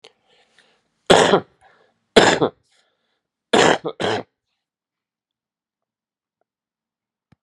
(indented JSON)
{
  "three_cough_length": "7.4 s",
  "three_cough_amplitude": 32768,
  "three_cough_signal_mean_std_ratio": 0.27,
  "survey_phase": "beta (2021-08-13 to 2022-03-07)",
  "age": "65+",
  "gender": "Male",
  "wearing_mask": "No",
  "symptom_cough_any": true,
  "symptom_new_continuous_cough": true,
  "symptom_runny_or_blocked_nose": true,
  "symptom_sore_throat": true,
  "symptom_fatigue": true,
  "symptom_change_to_sense_of_smell_or_taste": true,
  "symptom_loss_of_taste": true,
  "symptom_onset": "5 days",
  "smoker_status": "Never smoked",
  "respiratory_condition_asthma": false,
  "respiratory_condition_other": false,
  "recruitment_source": "Test and Trace",
  "submission_delay": "2 days",
  "covid_test_result": "Positive",
  "covid_test_method": "RT-qPCR",
  "covid_ct_value": 14.3,
  "covid_ct_gene": "N gene",
  "covid_ct_mean": 14.5,
  "covid_viral_load": "17000000 copies/ml",
  "covid_viral_load_category": "High viral load (>1M copies/ml)"
}